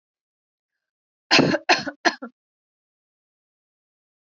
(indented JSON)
{
  "three_cough_length": "4.3 s",
  "three_cough_amplitude": 23233,
  "three_cough_signal_mean_std_ratio": 0.25,
  "survey_phase": "alpha (2021-03-01 to 2021-08-12)",
  "age": "18-44",
  "gender": "Female",
  "wearing_mask": "No",
  "symptom_none": true,
  "smoker_status": "Ex-smoker",
  "respiratory_condition_asthma": false,
  "respiratory_condition_other": false,
  "recruitment_source": "REACT",
  "submission_delay": "1 day",
  "covid_test_result": "Negative",
  "covid_test_method": "RT-qPCR"
}